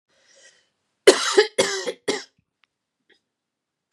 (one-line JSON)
{"cough_length": "3.9 s", "cough_amplitude": 32767, "cough_signal_mean_std_ratio": 0.28, "survey_phase": "beta (2021-08-13 to 2022-03-07)", "age": "45-64", "gender": "Female", "wearing_mask": "No", "symptom_cough_any": true, "symptom_runny_or_blocked_nose": true, "symptom_shortness_of_breath": true, "symptom_fatigue": true, "symptom_change_to_sense_of_smell_or_taste": true, "symptom_loss_of_taste": true, "symptom_onset": "9 days", "smoker_status": "Never smoked", "respiratory_condition_asthma": false, "respiratory_condition_other": false, "recruitment_source": "Test and Trace", "submission_delay": "1 day", "covid_test_result": "Positive", "covid_test_method": "RT-qPCR", "covid_ct_value": 19.6, "covid_ct_gene": "ORF1ab gene", "covid_ct_mean": 20.1, "covid_viral_load": "250000 copies/ml", "covid_viral_load_category": "Low viral load (10K-1M copies/ml)"}